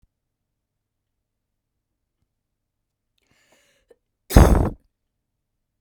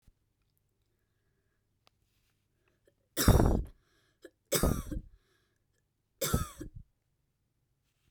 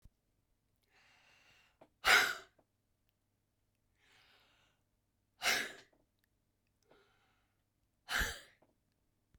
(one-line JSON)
{"cough_length": "5.8 s", "cough_amplitude": 32768, "cough_signal_mean_std_ratio": 0.18, "three_cough_length": "8.1 s", "three_cough_amplitude": 12153, "three_cough_signal_mean_std_ratio": 0.27, "exhalation_length": "9.4 s", "exhalation_amplitude": 6642, "exhalation_signal_mean_std_ratio": 0.22, "survey_phase": "beta (2021-08-13 to 2022-03-07)", "age": "18-44", "gender": "Female", "wearing_mask": "No", "symptom_none": true, "smoker_status": "Never smoked", "respiratory_condition_asthma": true, "respiratory_condition_other": false, "recruitment_source": "REACT", "submission_delay": "2 days", "covid_test_result": "Negative", "covid_test_method": "RT-qPCR"}